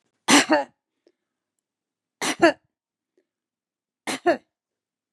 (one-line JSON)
{"three_cough_length": "5.1 s", "three_cough_amplitude": 31134, "three_cough_signal_mean_std_ratio": 0.27, "survey_phase": "beta (2021-08-13 to 2022-03-07)", "age": "65+", "gender": "Female", "wearing_mask": "No", "symptom_none": true, "smoker_status": "Never smoked", "respiratory_condition_asthma": false, "respiratory_condition_other": false, "recruitment_source": "REACT", "submission_delay": "5 days", "covid_test_result": "Negative", "covid_test_method": "RT-qPCR", "influenza_a_test_result": "Negative", "influenza_b_test_result": "Negative"}